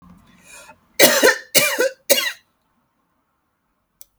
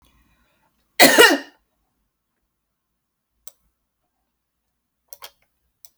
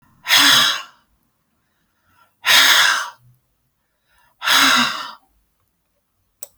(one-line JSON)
{"three_cough_length": "4.2 s", "three_cough_amplitude": 32768, "three_cough_signal_mean_std_ratio": 0.35, "cough_length": "6.0 s", "cough_amplitude": 32768, "cough_signal_mean_std_ratio": 0.2, "exhalation_length": "6.6 s", "exhalation_amplitude": 32768, "exhalation_signal_mean_std_ratio": 0.42, "survey_phase": "beta (2021-08-13 to 2022-03-07)", "age": "45-64", "gender": "Female", "wearing_mask": "No", "symptom_none": true, "smoker_status": "Never smoked", "respiratory_condition_asthma": false, "respiratory_condition_other": false, "recruitment_source": "REACT", "submission_delay": "2 days", "covid_test_result": "Negative", "covid_test_method": "RT-qPCR"}